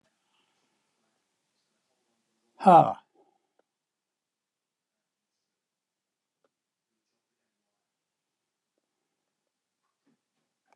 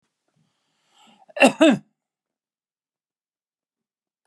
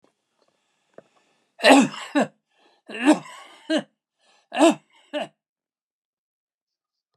{"exhalation_length": "10.8 s", "exhalation_amplitude": 19959, "exhalation_signal_mean_std_ratio": 0.12, "cough_length": "4.3 s", "cough_amplitude": 28586, "cough_signal_mean_std_ratio": 0.2, "three_cough_length": "7.2 s", "three_cough_amplitude": 28074, "three_cough_signal_mean_std_ratio": 0.28, "survey_phase": "beta (2021-08-13 to 2022-03-07)", "age": "65+", "gender": "Male", "wearing_mask": "No", "symptom_none": true, "smoker_status": "Ex-smoker", "respiratory_condition_asthma": true, "respiratory_condition_other": false, "recruitment_source": "REACT", "submission_delay": "2 days", "covid_test_result": "Negative", "covid_test_method": "RT-qPCR"}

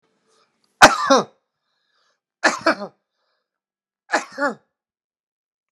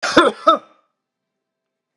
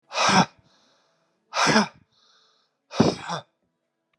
{"three_cough_length": "5.7 s", "three_cough_amplitude": 32768, "three_cough_signal_mean_std_ratio": 0.25, "cough_length": "2.0 s", "cough_amplitude": 32768, "cough_signal_mean_std_ratio": 0.32, "exhalation_length": "4.2 s", "exhalation_amplitude": 21479, "exhalation_signal_mean_std_ratio": 0.37, "survey_phase": "beta (2021-08-13 to 2022-03-07)", "age": "65+", "gender": "Male", "wearing_mask": "No", "symptom_none": true, "smoker_status": "Never smoked", "respiratory_condition_asthma": false, "respiratory_condition_other": false, "recruitment_source": "REACT", "submission_delay": "2 days", "covid_test_result": "Negative", "covid_test_method": "RT-qPCR", "influenza_a_test_result": "Negative", "influenza_b_test_result": "Negative"}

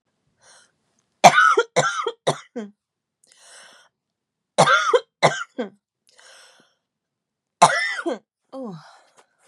{"three_cough_length": "9.5 s", "three_cough_amplitude": 32768, "three_cough_signal_mean_std_ratio": 0.32, "survey_phase": "beta (2021-08-13 to 2022-03-07)", "age": "18-44", "gender": "Female", "wearing_mask": "No", "symptom_none": true, "symptom_onset": "11 days", "smoker_status": "Never smoked", "respiratory_condition_asthma": false, "respiratory_condition_other": false, "recruitment_source": "REACT", "submission_delay": "3 days", "covid_test_result": "Negative", "covid_test_method": "RT-qPCR", "influenza_a_test_result": "Negative", "influenza_b_test_result": "Negative"}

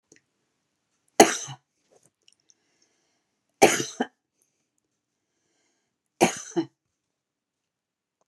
{"cough_length": "8.3 s", "cough_amplitude": 32767, "cough_signal_mean_std_ratio": 0.18, "survey_phase": "beta (2021-08-13 to 2022-03-07)", "age": "65+", "gender": "Female", "wearing_mask": "No", "symptom_none": true, "smoker_status": "Never smoked", "respiratory_condition_asthma": false, "respiratory_condition_other": false, "recruitment_source": "REACT", "submission_delay": "0 days", "covid_test_result": "Negative", "covid_test_method": "RT-qPCR"}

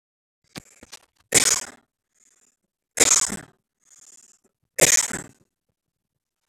{"three_cough_length": "6.5 s", "three_cough_amplitude": 30417, "three_cough_signal_mean_std_ratio": 0.27, "survey_phase": "beta (2021-08-13 to 2022-03-07)", "age": "18-44", "gender": "Male", "wearing_mask": "No", "symptom_none": true, "smoker_status": "Never smoked", "respiratory_condition_asthma": true, "respiratory_condition_other": false, "recruitment_source": "REACT", "submission_delay": "1 day", "covid_test_result": "Negative", "covid_test_method": "RT-qPCR"}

